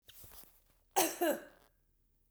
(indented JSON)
{
  "cough_length": "2.3 s",
  "cough_amplitude": 5919,
  "cough_signal_mean_std_ratio": 0.34,
  "survey_phase": "beta (2021-08-13 to 2022-03-07)",
  "age": "45-64",
  "gender": "Female",
  "wearing_mask": "No",
  "symptom_runny_or_blocked_nose": true,
  "smoker_status": "Never smoked",
  "respiratory_condition_asthma": false,
  "respiratory_condition_other": false,
  "recruitment_source": "Test and Trace",
  "submission_delay": "2 days",
  "covid_test_result": "Positive",
  "covid_test_method": "RT-qPCR",
  "covid_ct_value": 27.1,
  "covid_ct_gene": "N gene"
}